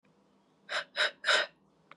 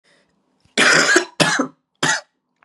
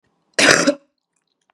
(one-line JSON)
{"exhalation_length": "2.0 s", "exhalation_amplitude": 6649, "exhalation_signal_mean_std_ratio": 0.39, "three_cough_length": "2.6 s", "three_cough_amplitude": 32767, "three_cough_signal_mean_std_ratio": 0.48, "cough_length": "1.5 s", "cough_amplitude": 32768, "cough_signal_mean_std_ratio": 0.37, "survey_phase": "beta (2021-08-13 to 2022-03-07)", "age": "18-44", "gender": "Female", "wearing_mask": "No", "symptom_cough_any": true, "symptom_runny_or_blocked_nose": true, "symptom_sore_throat": true, "symptom_diarrhoea": true, "symptom_fatigue": true, "symptom_fever_high_temperature": true, "symptom_headache": true, "smoker_status": "Never smoked", "respiratory_condition_asthma": false, "respiratory_condition_other": false, "recruitment_source": "Test and Trace", "submission_delay": "1 day", "covid_test_result": "Positive", "covid_test_method": "LFT"}